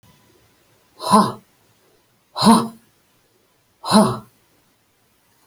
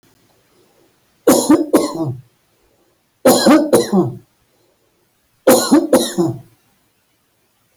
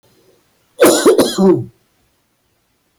{
  "exhalation_length": "5.5 s",
  "exhalation_amplitude": 30634,
  "exhalation_signal_mean_std_ratio": 0.31,
  "three_cough_length": "7.8 s",
  "three_cough_amplitude": 31002,
  "three_cough_signal_mean_std_ratio": 0.44,
  "cough_length": "3.0 s",
  "cough_amplitude": 31445,
  "cough_signal_mean_std_ratio": 0.43,
  "survey_phase": "beta (2021-08-13 to 2022-03-07)",
  "age": "65+",
  "gender": "Male",
  "wearing_mask": "No",
  "symptom_none": true,
  "smoker_status": "Ex-smoker",
  "respiratory_condition_asthma": false,
  "respiratory_condition_other": false,
  "recruitment_source": "REACT",
  "submission_delay": "1 day",
  "covid_test_result": "Negative",
  "covid_test_method": "RT-qPCR"
}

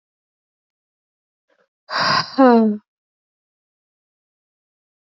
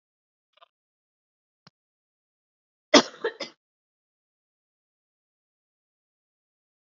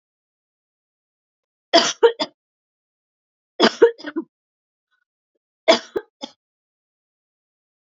{
  "exhalation_length": "5.1 s",
  "exhalation_amplitude": 26872,
  "exhalation_signal_mean_std_ratio": 0.29,
  "cough_length": "6.8 s",
  "cough_amplitude": 30433,
  "cough_signal_mean_std_ratio": 0.11,
  "three_cough_length": "7.9 s",
  "three_cough_amplitude": 29955,
  "three_cough_signal_mean_std_ratio": 0.22,
  "survey_phase": "beta (2021-08-13 to 2022-03-07)",
  "age": "18-44",
  "gender": "Female",
  "wearing_mask": "No",
  "symptom_cough_any": true,
  "symptom_new_continuous_cough": true,
  "symptom_fatigue": true,
  "symptom_headache": true,
  "symptom_change_to_sense_of_smell_or_taste": true,
  "symptom_loss_of_taste": true,
  "symptom_onset": "5 days",
  "smoker_status": "Never smoked",
  "respiratory_condition_asthma": false,
  "respiratory_condition_other": false,
  "recruitment_source": "Test and Trace",
  "submission_delay": "2 days",
  "covid_test_result": "Positive",
  "covid_test_method": "RT-qPCR"
}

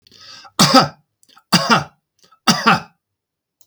{
  "three_cough_length": "3.7 s",
  "three_cough_amplitude": 32768,
  "three_cough_signal_mean_std_ratio": 0.38,
  "survey_phase": "beta (2021-08-13 to 2022-03-07)",
  "age": "65+",
  "gender": "Male",
  "wearing_mask": "No",
  "symptom_none": true,
  "smoker_status": "Never smoked",
  "respiratory_condition_asthma": false,
  "respiratory_condition_other": false,
  "recruitment_source": "REACT",
  "submission_delay": "1 day",
  "covid_test_result": "Negative",
  "covid_test_method": "RT-qPCR",
  "influenza_a_test_result": "Negative",
  "influenza_b_test_result": "Negative"
}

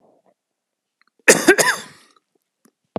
{
  "cough_length": "3.0 s",
  "cough_amplitude": 32768,
  "cough_signal_mean_std_ratio": 0.27,
  "survey_phase": "alpha (2021-03-01 to 2021-08-12)",
  "age": "45-64",
  "gender": "Male",
  "wearing_mask": "Yes",
  "symptom_cough_any": true,
  "symptom_shortness_of_breath": true,
  "symptom_fatigue": true,
  "symptom_headache": true,
  "symptom_onset": "3 days",
  "smoker_status": "Ex-smoker",
  "respiratory_condition_asthma": false,
  "respiratory_condition_other": true,
  "recruitment_source": "Test and Trace",
  "submission_delay": "2 days",
  "covid_test_result": "Positive",
  "covid_test_method": "RT-qPCR",
  "covid_ct_value": 17.1,
  "covid_ct_gene": "ORF1ab gene",
  "covid_ct_mean": 17.3,
  "covid_viral_load": "2100000 copies/ml",
  "covid_viral_load_category": "High viral load (>1M copies/ml)"
}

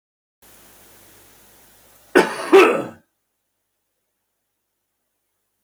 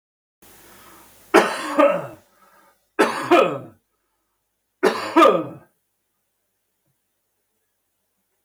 {
  "cough_length": "5.6 s",
  "cough_amplitude": 32768,
  "cough_signal_mean_std_ratio": 0.23,
  "three_cough_length": "8.4 s",
  "three_cough_amplitude": 32766,
  "three_cough_signal_mean_std_ratio": 0.32,
  "survey_phase": "beta (2021-08-13 to 2022-03-07)",
  "age": "65+",
  "gender": "Male",
  "wearing_mask": "No",
  "symptom_none": true,
  "smoker_status": "Ex-smoker",
  "respiratory_condition_asthma": false,
  "respiratory_condition_other": false,
  "recruitment_source": "REACT",
  "submission_delay": "1 day",
  "covid_test_result": "Negative",
  "covid_test_method": "RT-qPCR",
  "influenza_a_test_result": "Negative",
  "influenza_b_test_result": "Negative"
}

